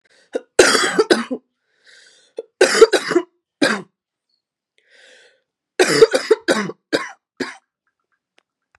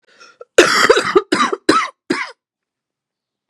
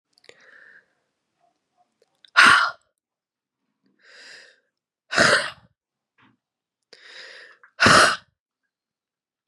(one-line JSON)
{"three_cough_length": "8.8 s", "three_cough_amplitude": 32768, "three_cough_signal_mean_std_ratio": 0.35, "cough_length": "3.5 s", "cough_amplitude": 32768, "cough_signal_mean_std_ratio": 0.42, "exhalation_length": "9.5 s", "exhalation_amplitude": 30958, "exhalation_signal_mean_std_ratio": 0.26, "survey_phase": "beta (2021-08-13 to 2022-03-07)", "age": "45-64", "gender": "Female", "wearing_mask": "No", "symptom_cough_any": true, "symptom_fatigue": true, "symptom_other": true, "symptom_onset": "4 days", "smoker_status": "Ex-smoker", "respiratory_condition_asthma": true, "respiratory_condition_other": false, "recruitment_source": "Test and Trace", "submission_delay": "2 days", "covid_test_result": "Positive", "covid_test_method": "RT-qPCR", "covid_ct_value": 15.3, "covid_ct_gene": "ORF1ab gene", "covid_ct_mean": 15.5, "covid_viral_load": "8400000 copies/ml", "covid_viral_load_category": "High viral load (>1M copies/ml)"}